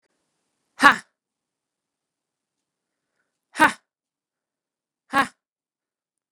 {"exhalation_length": "6.3 s", "exhalation_amplitude": 32768, "exhalation_signal_mean_std_ratio": 0.15, "survey_phase": "beta (2021-08-13 to 2022-03-07)", "age": "18-44", "gender": "Female", "wearing_mask": "No", "symptom_cough_any": true, "symptom_runny_or_blocked_nose": true, "symptom_sore_throat": true, "symptom_onset": "3 days", "smoker_status": "Never smoked", "respiratory_condition_asthma": false, "respiratory_condition_other": false, "recruitment_source": "Test and Trace", "submission_delay": "2 days", "covid_test_result": "Positive", "covid_test_method": "RT-qPCR", "covid_ct_value": 24.6, "covid_ct_gene": "N gene"}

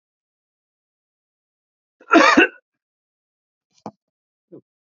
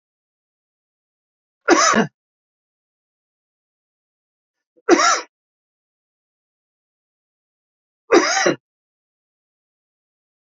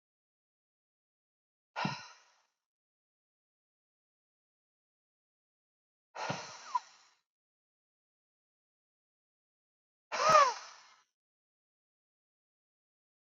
{"cough_length": "4.9 s", "cough_amplitude": 32767, "cough_signal_mean_std_ratio": 0.21, "three_cough_length": "10.5 s", "three_cough_amplitude": 29653, "three_cough_signal_mean_std_ratio": 0.25, "exhalation_length": "13.2 s", "exhalation_amplitude": 9217, "exhalation_signal_mean_std_ratio": 0.18, "survey_phase": "beta (2021-08-13 to 2022-03-07)", "age": "45-64", "gender": "Male", "wearing_mask": "No", "symptom_cough_any": true, "symptom_runny_or_blocked_nose": true, "symptom_diarrhoea": true, "symptom_fatigue": true, "symptom_headache": true, "symptom_change_to_sense_of_smell_or_taste": true, "symptom_loss_of_taste": true, "symptom_onset": "4 days", "smoker_status": "Current smoker (e-cigarettes or vapes only)", "respiratory_condition_asthma": false, "respiratory_condition_other": false, "recruitment_source": "Test and Trace", "submission_delay": "2 days", "covid_test_result": "Positive", "covid_test_method": "RT-qPCR", "covid_ct_value": 20.2, "covid_ct_gene": "ORF1ab gene"}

